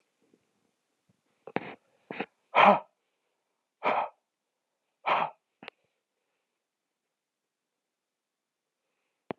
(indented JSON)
{
  "exhalation_length": "9.4 s",
  "exhalation_amplitude": 14762,
  "exhalation_signal_mean_std_ratio": 0.21,
  "survey_phase": "beta (2021-08-13 to 2022-03-07)",
  "age": "45-64",
  "gender": "Male",
  "wearing_mask": "No",
  "symptom_none": true,
  "smoker_status": "Ex-smoker",
  "respiratory_condition_asthma": false,
  "respiratory_condition_other": false,
  "recruitment_source": "REACT",
  "submission_delay": "2 days",
  "covid_test_result": "Negative",
  "covid_test_method": "RT-qPCR"
}